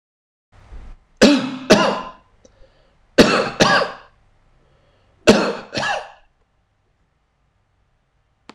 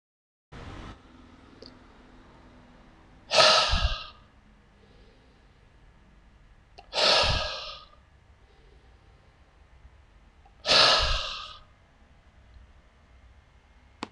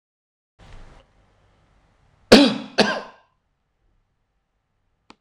three_cough_length: 8.5 s
three_cough_amplitude: 26743
three_cough_signal_mean_std_ratio: 0.35
exhalation_length: 14.1 s
exhalation_amplitude: 22931
exhalation_signal_mean_std_ratio: 0.33
cough_length: 5.2 s
cough_amplitude: 26982
cough_signal_mean_std_ratio: 0.21
survey_phase: beta (2021-08-13 to 2022-03-07)
age: 65+
gender: Male
wearing_mask: 'No'
symptom_cough_any: true
smoker_status: Ex-smoker
respiratory_condition_asthma: false
respiratory_condition_other: false
recruitment_source: REACT
submission_delay: 15 days
covid_test_result: Negative
covid_test_method: RT-qPCR
influenza_a_test_result: Negative
influenza_b_test_result: Negative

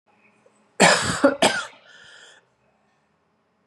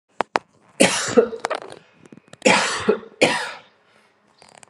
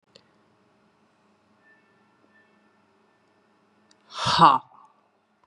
cough_length: 3.7 s
cough_amplitude: 29437
cough_signal_mean_std_ratio: 0.33
three_cough_length: 4.7 s
three_cough_amplitude: 32768
three_cough_signal_mean_std_ratio: 0.39
exhalation_length: 5.5 s
exhalation_amplitude: 26695
exhalation_signal_mean_std_ratio: 0.2
survey_phase: beta (2021-08-13 to 2022-03-07)
age: 18-44
gender: Female
wearing_mask: 'No'
symptom_cough_any: true
symptom_runny_or_blocked_nose: true
symptom_sore_throat: true
symptom_onset: 4 days
smoker_status: Never smoked
respiratory_condition_asthma: false
respiratory_condition_other: false
recruitment_source: Test and Trace
submission_delay: 1 day
covid_test_result: Positive
covid_test_method: RT-qPCR
covid_ct_value: 17.3
covid_ct_gene: ORF1ab gene
covid_ct_mean: 18.0
covid_viral_load: 1300000 copies/ml
covid_viral_load_category: High viral load (>1M copies/ml)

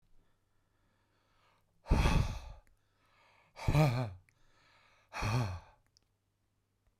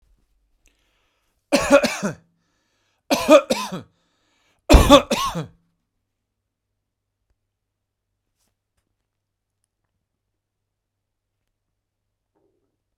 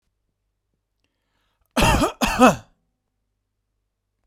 exhalation_length: 7.0 s
exhalation_amplitude: 5913
exhalation_signal_mean_std_ratio: 0.36
three_cough_length: 13.0 s
three_cough_amplitude: 32768
three_cough_signal_mean_std_ratio: 0.22
cough_length: 4.3 s
cough_amplitude: 30881
cough_signal_mean_std_ratio: 0.29
survey_phase: beta (2021-08-13 to 2022-03-07)
age: 45-64
gender: Male
wearing_mask: 'No'
symptom_none: true
smoker_status: Never smoked
respiratory_condition_asthma: false
respiratory_condition_other: false
recruitment_source: REACT
submission_delay: 2 days
covid_test_result: Negative
covid_test_method: RT-qPCR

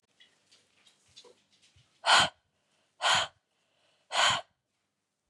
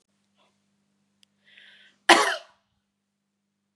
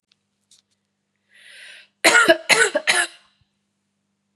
exhalation_length: 5.3 s
exhalation_amplitude: 10719
exhalation_signal_mean_std_ratio: 0.3
cough_length: 3.8 s
cough_amplitude: 31899
cough_signal_mean_std_ratio: 0.19
three_cough_length: 4.4 s
three_cough_amplitude: 32767
three_cough_signal_mean_std_ratio: 0.33
survey_phase: beta (2021-08-13 to 2022-03-07)
age: 18-44
gender: Female
wearing_mask: 'No'
symptom_runny_or_blocked_nose: true
symptom_shortness_of_breath: true
symptom_fatigue: true
symptom_headache: true
symptom_change_to_sense_of_smell_or_taste: true
smoker_status: Never smoked
respiratory_condition_asthma: false
respiratory_condition_other: false
recruitment_source: Test and Trace
submission_delay: 2 days
covid_test_result: Positive
covid_test_method: RT-qPCR
covid_ct_value: 24.9
covid_ct_gene: ORF1ab gene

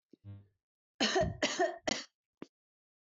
three_cough_length: 3.2 s
three_cough_amplitude: 4512
three_cough_signal_mean_std_ratio: 0.4
survey_phase: beta (2021-08-13 to 2022-03-07)
age: 45-64
gender: Female
wearing_mask: 'No'
symptom_none: true
smoker_status: Never smoked
respiratory_condition_asthma: true
respiratory_condition_other: false
recruitment_source: REACT
submission_delay: 1 day
covid_test_result: Negative
covid_test_method: RT-qPCR
influenza_a_test_result: Negative
influenza_b_test_result: Negative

